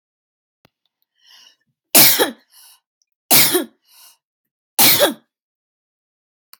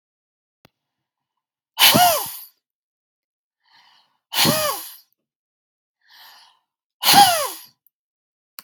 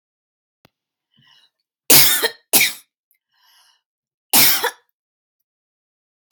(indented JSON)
{
  "three_cough_length": "6.6 s",
  "three_cough_amplitude": 32768,
  "three_cough_signal_mean_std_ratio": 0.31,
  "exhalation_length": "8.6 s",
  "exhalation_amplitude": 32716,
  "exhalation_signal_mean_std_ratio": 0.31,
  "cough_length": "6.3 s",
  "cough_amplitude": 32768,
  "cough_signal_mean_std_ratio": 0.29,
  "survey_phase": "beta (2021-08-13 to 2022-03-07)",
  "age": "45-64",
  "gender": "Female",
  "wearing_mask": "No",
  "symptom_sore_throat": true,
  "smoker_status": "Never smoked",
  "respiratory_condition_asthma": true,
  "respiratory_condition_other": false,
  "recruitment_source": "REACT",
  "submission_delay": "1 day",
  "covid_test_result": "Negative",
  "covid_test_method": "RT-qPCR"
}